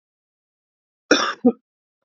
{"cough_length": "2.0 s", "cough_amplitude": 31124, "cough_signal_mean_std_ratio": 0.27, "survey_phase": "beta (2021-08-13 to 2022-03-07)", "age": "45-64", "gender": "Male", "wearing_mask": "No", "symptom_cough_any": true, "symptom_runny_or_blocked_nose": true, "symptom_sore_throat": true, "symptom_diarrhoea": true, "symptom_fatigue": true, "symptom_fever_high_temperature": true, "symptom_loss_of_taste": true, "symptom_onset": "4 days", "smoker_status": "Current smoker (e-cigarettes or vapes only)", "respiratory_condition_asthma": false, "respiratory_condition_other": false, "recruitment_source": "Test and Trace", "submission_delay": "1 day", "covid_test_result": "Positive", "covid_test_method": "RT-qPCR", "covid_ct_value": 14.3, "covid_ct_gene": "ORF1ab gene", "covid_ct_mean": 14.7, "covid_viral_load": "15000000 copies/ml", "covid_viral_load_category": "High viral load (>1M copies/ml)"}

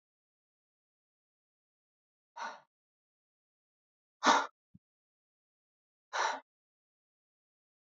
{"exhalation_length": "7.9 s", "exhalation_amplitude": 10105, "exhalation_signal_mean_std_ratio": 0.18, "survey_phase": "alpha (2021-03-01 to 2021-08-12)", "age": "18-44", "gender": "Male", "wearing_mask": "No", "symptom_none": true, "smoker_status": "Never smoked", "respiratory_condition_asthma": false, "respiratory_condition_other": false, "recruitment_source": "REACT", "submission_delay": "2 days", "covid_test_result": "Negative", "covid_test_method": "RT-qPCR"}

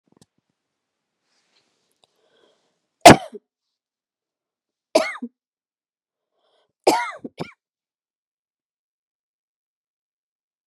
{"three_cough_length": "10.7 s", "three_cough_amplitude": 32768, "three_cough_signal_mean_std_ratio": 0.13, "survey_phase": "beta (2021-08-13 to 2022-03-07)", "age": "45-64", "gender": "Female", "wearing_mask": "No", "symptom_runny_or_blocked_nose": true, "symptom_sore_throat": true, "symptom_abdominal_pain": true, "symptom_fatigue": true, "symptom_headache": true, "symptom_other": true, "symptom_onset": "2 days", "smoker_status": "Never smoked", "respiratory_condition_asthma": false, "respiratory_condition_other": false, "recruitment_source": "Test and Trace", "submission_delay": "1 day", "covid_test_result": "Positive", "covid_test_method": "RT-qPCR", "covid_ct_value": 20.8, "covid_ct_gene": "ORF1ab gene", "covid_ct_mean": 21.1, "covid_viral_load": "120000 copies/ml", "covid_viral_load_category": "Low viral load (10K-1M copies/ml)"}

